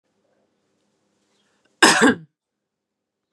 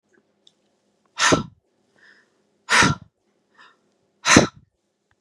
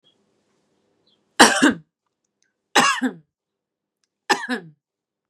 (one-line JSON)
{"cough_length": "3.3 s", "cough_amplitude": 32768, "cough_signal_mean_std_ratio": 0.24, "exhalation_length": "5.2 s", "exhalation_amplitude": 32768, "exhalation_signal_mean_std_ratio": 0.28, "three_cough_length": "5.3 s", "three_cough_amplitude": 32768, "three_cough_signal_mean_std_ratio": 0.28, "survey_phase": "beta (2021-08-13 to 2022-03-07)", "age": "45-64", "gender": "Female", "wearing_mask": "No", "symptom_none": true, "smoker_status": "Never smoked", "respiratory_condition_asthma": false, "respiratory_condition_other": false, "recruitment_source": "Test and Trace", "submission_delay": "-1 day", "covid_test_result": "Negative", "covid_test_method": "LFT"}